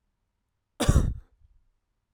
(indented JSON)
{
  "cough_length": "2.1 s",
  "cough_amplitude": 14724,
  "cough_signal_mean_std_ratio": 0.29,
  "survey_phase": "alpha (2021-03-01 to 2021-08-12)",
  "age": "18-44",
  "gender": "Male",
  "wearing_mask": "No",
  "symptom_cough_any": true,
  "symptom_shortness_of_breath": true,
  "symptom_fatigue": true,
  "symptom_fever_high_temperature": true,
  "symptom_headache": true,
  "symptom_onset": "3 days",
  "smoker_status": "Never smoked",
  "respiratory_condition_asthma": false,
  "respiratory_condition_other": false,
  "recruitment_source": "Test and Trace",
  "submission_delay": "2 days",
  "covid_test_result": "Positive",
  "covid_test_method": "RT-qPCR",
  "covid_ct_value": 17.2,
  "covid_ct_gene": "ORF1ab gene",
  "covid_ct_mean": 20.6,
  "covid_viral_load": "170000 copies/ml",
  "covid_viral_load_category": "Low viral load (10K-1M copies/ml)"
}